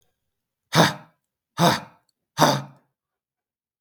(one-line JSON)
{"exhalation_length": "3.8 s", "exhalation_amplitude": 32767, "exhalation_signal_mean_std_ratio": 0.3, "survey_phase": "beta (2021-08-13 to 2022-03-07)", "age": "18-44", "gender": "Male", "wearing_mask": "No", "symptom_none": true, "smoker_status": "Never smoked", "respiratory_condition_asthma": false, "respiratory_condition_other": false, "recruitment_source": "REACT", "submission_delay": "2 days", "covid_test_result": "Negative", "covid_test_method": "RT-qPCR"}